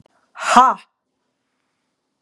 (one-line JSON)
{"exhalation_length": "2.2 s", "exhalation_amplitude": 32768, "exhalation_signal_mean_std_ratio": 0.27, "survey_phase": "beta (2021-08-13 to 2022-03-07)", "age": "45-64", "gender": "Female", "wearing_mask": "No", "symptom_none": true, "smoker_status": "Never smoked", "respiratory_condition_asthma": false, "respiratory_condition_other": false, "recruitment_source": "REACT", "submission_delay": "1 day", "covid_test_result": "Negative", "covid_test_method": "RT-qPCR", "influenza_a_test_result": "Negative", "influenza_b_test_result": "Negative"}